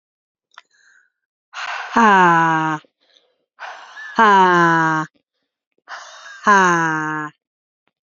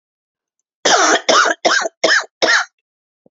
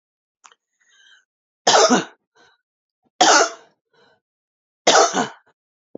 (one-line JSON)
{"exhalation_length": "8.0 s", "exhalation_amplitude": 30238, "exhalation_signal_mean_std_ratio": 0.47, "cough_length": "3.3 s", "cough_amplitude": 32349, "cough_signal_mean_std_ratio": 0.53, "three_cough_length": "6.0 s", "three_cough_amplitude": 32534, "three_cough_signal_mean_std_ratio": 0.33, "survey_phase": "beta (2021-08-13 to 2022-03-07)", "age": "45-64", "gender": "Female", "wearing_mask": "No", "symptom_cough_any": true, "symptom_runny_or_blocked_nose": true, "symptom_shortness_of_breath": true, "symptom_sore_throat": true, "symptom_diarrhoea": true, "symptom_fatigue": true, "symptom_fever_high_temperature": true, "symptom_headache": true, "symptom_onset": "2 days", "smoker_status": "Ex-smoker", "respiratory_condition_asthma": true, "respiratory_condition_other": false, "recruitment_source": "Test and Trace", "submission_delay": "1 day", "covid_test_result": "Positive", "covid_test_method": "RT-qPCR", "covid_ct_value": 33.9, "covid_ct_gene": "N gene"}